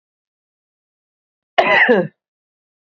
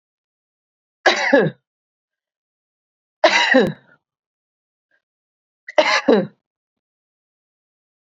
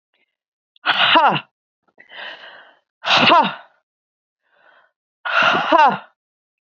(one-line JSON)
{"cough_length": "2.9 s", "cough_amplitude": 31687, "cough_signal_mean_std_ratio": 0.33, "three_cough_length": "8.0 s", "three_cough_amplitude": 29045, "three_cough_signal_mean_std_ratio": 0.31, "exhalation_length": "6.7 s", "exhalation_amplitude": 30313, "exhalation_signal_mean_std_ratio": 0.42, "survey_phase": "beta (2021-08-13 to 2022-03-07)", "age": "45-64", "gender": "Female", "wearing_mask": "No", "symptom_none": true, "smoker_status": "Current smoker (11 or more cigarettes per day)", "respiratory_condition_asthma": false, "respiratory_condition_other": false, "recruitment_source": "REACT", "submission_delay": "7 days", "covid_test_result": "Negative", "covid_test_method": "RT-qPCR", "influenza_a_test_result": "Negative", "influenza_b_test_result": "Negative"}